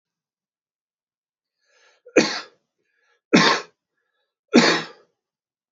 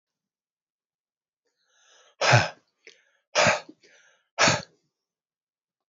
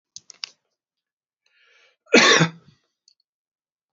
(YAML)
three_cough_length: 5.7 s
three_cough_amplitude: 29989
three_cough_signal_mean_std_ratio: 0.27
exhalation_length: 5.9 s
exhalation_amplitude: 19854
exhalation_signal_mean_std_ratio: 0.27
cough_length: 3.9 s
cough_amplitude: 29168
cough_signal_mean_std_ratio: 0.24
survey_phase: alpha (2021-03-01 to 2021-08-12)
age: 45-64
gender: Male
wearing_mask: 'No'
symptom_fatigue: true
symptom_headache: true
smoker_status: Ex-smoker
respiratory_condition_asthma: true
respiratory_condition_other: false
recruitment_source: Test and Trace
submission_delay: 2 days
covid_test_result: Positive
covid_test_method: LFT